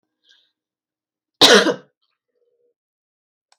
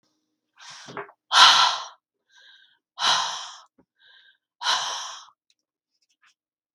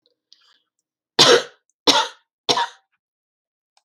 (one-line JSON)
{"cough_length": "3.6 s", "cough_amplitude": 32768, "cough_signal_mean_std_ratio": 0.23, "exhalation_length": "6.7 s", "exhalation_amplitude": 32768, "exhalation_signal_mean_std_ratio": 0.31, "three_cough_length": "3.8 s", "three_cough_amplitude": 32767, "three_cough_signal_mean_std_ratio": 0.29, "survey_phase": "beta (2021-08-13 to 2022-03-07)", "age": "45-64", "gender": "Female", "wearing_mask": "No", "symptom_fatigue": true, "smoker_status": "Never smoked", "respiratory_condition_asthma": false, "respiratory_condition_other": false, "recruitment_source": "REACT", "submission_delay": "1 day", "covid_test_result": "Negative", "covid_test_method": "RT-qPCR", "influenza_a_test_result": "Negative", "influenza_b_test_result": "Negative"}